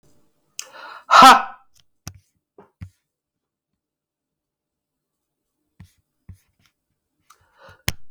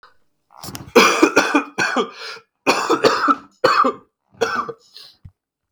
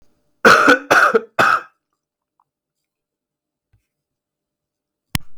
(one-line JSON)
{"exhalation_length": "8.1 s", "exhalation_amplitude": 32768, "exhalation_signal_mean_std_ratio": 0.18, "three_cough_length": "5.7 s", "three_cough_amplitude": 32768, "three_cough_signal_mean_std_ratio": 0.49, "cough_length": "5.4 s", "cough_amplitude": 32768, "cough_signal_mean_std_ratio": 0.33, "survey_phase": "beta (2021-08-13 to 2022-03-07)", "age": "18-44", "gender": "Male", "wearing_mask": "No", "symptom_cough_any": true, "symptom_new_continuous_cough": true, "symptom_runny_or_blocked_nose": true, "symptom_sore_throat": true, "symptom_fatigue": true, "symptom_headache": true, "symptom_onset": "12 days", "smoker_status": "Ex-smoker", "respiratory_condition_asthma": false, "respiratory_condition_other": false, "recruitment_source": "REACT", "submission_delay": "3 days", "covid_test_result": "Negative", "covid_test_method": "RT-qPCR"}